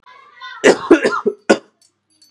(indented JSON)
{
  "cough_length": "2.3 s",
  "cough_amplitude": 32768,
  "cough_signal_mean_std_ratio": 0.38,
  "survey_phase": "beta (2021-08-13 to 2022-03-07)",
  "age": "18-44",
  "gender": "Male",
  "wearing_mask": "Yes",
  "symptom_cough_any": true,
  "symptom_runny_or_blocked_nose": true,
  "symptom_sore_throat": true,
  "symptom_other": true,
  "symptom_onset": "2 days",
  "smoker_status": "Never smoked",
  "respiratory_condition_asthma": false,
  "respiratory_condition_other": false,
  "recruitment_source": "Test and Trace",
  "submission_delay": "1 day",
  "covid_test_result": "Positive",
  "covid_test_method": "RT-qPCR",
  "covid_ct_value": 20.5,
  "covid_ct_gene": "N gene"
}